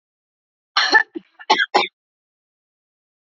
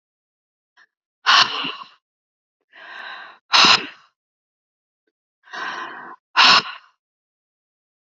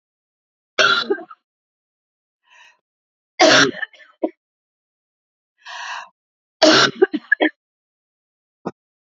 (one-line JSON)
{"cough_length": "3.2 s", "cough_amplitude": 32124, "cough_signal_mean_std_ratio": 0.31, "exhalation_length": "8.2 s", "exhalation_amplitude": 32581, "exhalation_signal_mean_std_ratio": 0.29, "three_cough_length": "9.0 s", "three_cough_amplitude": 32053, "three_cough_signal_mean_std_ratio": 0.3, "survey_phase": "beta (2021-08-13 to 2022-03-07)", "age": "45-64", "gender": "Female", "wearing_mask": "No", "symptom_none": true, "smoker_status": "Never smoked", "respiratory_condition_asthma": false, "respiratory_condition_other": false, "recruitment_source": "REACT", "submission_delay": "1 day", "covid_test_result": "Negative", "covid_test_method": "RT-qPCR", "influenza_a_test_result": "Negative", "influenza_b_test_result": "Negative"}